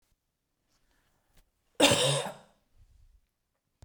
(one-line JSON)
{"cough_length": "3.8 s", "cough_amplitude": 15049, "cough_signal_mean_std_ratio": 0.28, "survey_phase": "beta (2021-08-13 to 2022-03-07)", "age": "45-64", "gender": "Female", "wearing_mask": "No", "symptom_none": true, "smoker_status": "Never smoked", "respiratory_condition_asthma": false, "respiratory_condition_other": false, "recruitment_source": "REACT", "submission_delay": "2 days", "covid_test_result": "Negative", "covid_test_method": "RT-qPCR"}